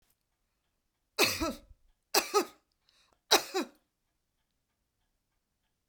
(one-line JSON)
{"three_cough_length": "5.9 s", "three_cough_amplitude": 15015, "three_cough_signal_mean_std_ratio": 0.26, "survey_phase": "beta (2021-08-13 to 2022-03-07)", "age": "45-64", "gender": "Female", "wearing_mask": "No", "symptom_none": true, "smoker_status": "Never smoked", "respiratory_condition_asthma": false, "respiratory_condition_other": false, "recruitment_source": "Test and Trace", "submission_delay": "2 days", "covid_test_result": "Negative", "covid_test_method": "RT-qPCR"}